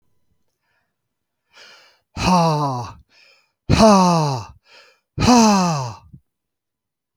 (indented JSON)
{
  "exhalation_length": "7.2 s",
  "exhalation_amplitude": 28688,
  "exhalation_signal_mean_std_ratio": 0.44,
  "survey_phase": "beta (2021-08-13 to 2022-03-07)",
  "age": "45-64",
  "gender": "Male",
  "wearing_mask": "No",
  "symptom_none": true,
  "smoker_status": "Never smoked",
  "respiratory_condition_asthma": false,
  "respiratory_condition_other": false,
  "recruitment_source": "REACT",
  "submission_delay": "2 days",
  "covid_test_result": "Negative",
  "covid_test_method": "RT-qPCR"
}